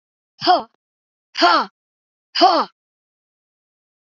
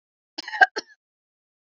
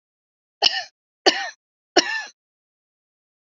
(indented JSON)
{
  "exhalation_length": "4.1 s",
  "exhalation_amplitude": 27944,
  "exhalation_signal_mean_std_ratio": 0.33,
  "cough_length": "1.8 s",
  "cough_amplitude": 27123,
  "cough_signal_mean_std_ratio": 0.18,
  "three_cough_length": "3.6 s",
  "three_cough_amplitude": 31548,
  "three_cough_signal_mean_std_ratio": 0.26,
  "survey_phase": "beta (2021-08-13 to 2022-03-07)",
  "age": "45-64",
  "gender": "Female",
  "wearing_mask": "No",
  "symptom_none": true,
  "smoker_status": "Ex-smoker",
  "respiratory_condition_asthma": true,
  "respiratory_condition_other": false,
  "recruitment_source": "REACT",
  "submission_delay": "2 days",
  "covid_test_result": "Negative",
  "covid_test_method": "RT-qPCR",
  "influenza_a_test_result": "Negative",
  "influenza_b_test_result": "Negative"
}